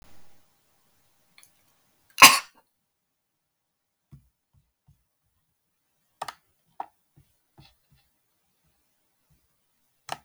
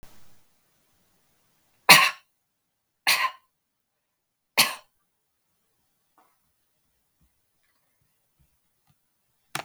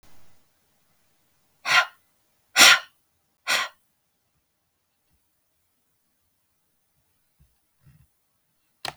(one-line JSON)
{"cough_length": "10.2 s", "cough_amplitude": 32768, "cough_signal_mean_std_ratio": 0.11, "three_cough_length": "9.6 s", "three_cough_amplitude": 32768, "three_cough_signal_mean_std_ratio": 0.18, "exhalation_length": "9.0 s", "exhalation_amplitude": 32768, "exhalation_signal_mean_std_ratio": 0.19, "survey_phase": "beta (2021-08-13 to 2022-03-07)", "age": "45-64", "gender": "Female", "wearing_mask": "No", "symptom_none": true, "smoker_status": "Ex-smoker", "respiratory_condition_asthma": false, "respiratory_condition_other": false, "recruitment_source": "REACT", "submission_delay": "1 day", "covid_test_result": "Negative", "covid_test_method": "RT-qPCR"}